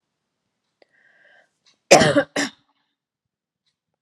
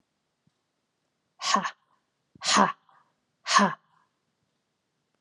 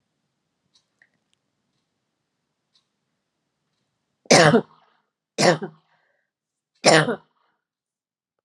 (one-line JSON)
{"cough_length": "4.0 s", "cough_amplitude": 32768, "cough_signal_mean_std_ratio": 0.23, "exhalation_length": "5.2 s", "exhalation_amplitude": 19834, "exhalation_signal_mean_std_ratio": 0.28, "three_cough_length": "8.4 s", "three_cough_amplitude": 30244, "three_cough_signal_mean_std_ratio": 0.23, "survey_phase": "beta (2021-08-13 to 2022-03-07)", "age": "45-64", "gender": "Female", "wearing_mask": "No", "symptom_headache": true, "symptom_onset": "12 days", "smoker_status": "Ex-smoker", "respiratory_condition_asthma": false, "respiratory_condition_other": false, "recruitment_source": "REACT", "submission_delay": "2 days", "covid_test_result": "Negative", "covid_test_method": "RT-qPCR", "influenza_a_test_result": "Unknown/Void", "influenza_b_test_result": "Unknown/Void"}